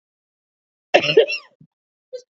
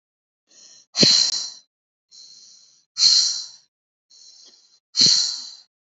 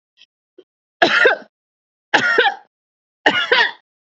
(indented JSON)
{
  "cough_length": "2.3 s",
  "cough_amplitude": 28010,
  "cough_signal_mean_std_ratio": 0.29,
  "exhalation_length": "6.0 s",
  "exhalation_amplitude": 27270,
  "exhalation_signal_mean_std_ratio": 0.38,
  "three_cough_length": "4.2 s",
  "three_cough_amplitude": 32706,
  "three_cough_signal_mean_std_ratio": 0.42,
  "survey_phase": "beta (2021-08-13 to 2022-03-07)",
  "age": "18-44",
  "gender": "Female",
  "wearing_mask": "No",
  "symptom_none": true,
  "smoker_status": "Never smoked",
  "respiratory_condition_asthma": false,
  "respiratory_condition_other": false,
  "recruitment_source": "REACT",
  "submission_delay": "2 days",
  "covid_test_result": "Negative",
  "covid_test_method": "RT-qPCR",
  "influenza_a_test_result": "Negative",
  "influenza_b_test_result": "Negative"
}